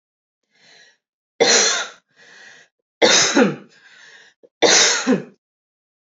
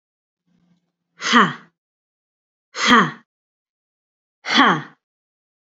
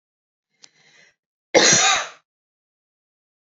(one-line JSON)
{"three_cough_length": "6.1 s", "three_cough_amplitude": 29586, "three_cough_signal_mean_std_ratio": 0.42, "exhalation_length": "5.6 s", "exhalation_amplitude": 27445, "exhalation_signal_mean_std_ratio": 0.31, "cough_length": "3.4 s", "cough_amplitude": 29110, "cough_signal_mean_std_ratio": 0.31, "survey_phase": "beta (2021-08-13 to 2022-03-07)", "age": "18-44", "gender": "Female", "wearing_mask": "No", "symptom_none": true, "symptom_onset": "11 days", "smoker_status": "Never smoked", "respiratory_condition_asthma": true, "respiratory_condition_other": false, "recruitment_source": "Test and Trace", "submission_delay": "1 day", "covid_test_result": "Positive", "covid_test_method": "RT-qPCR", "covid_ct_value": 25.7, "covid_ct_gene": "N gene"}